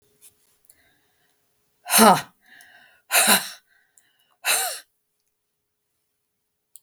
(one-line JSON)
{"exhalation_length": "6.8 s", "exhalation_amplitude": 32766, "exhalation_signal_mean_std_ratio": 0.27, "survey_phase": "beta (2021-08-13 to 2022-03-07)", "age": "65+", "gender": "Female", "wearing_mask": "No", "symptom_none": true, "smoker_status": "Prefer not to say", "respiratory_condition_asthma": false, "respiratory_condition_other": false, "recruitment_source": "REACT", "submission_delay": "1 day", "covid_test_result": "Negative", "covid_test_method": "RT-qPCR"}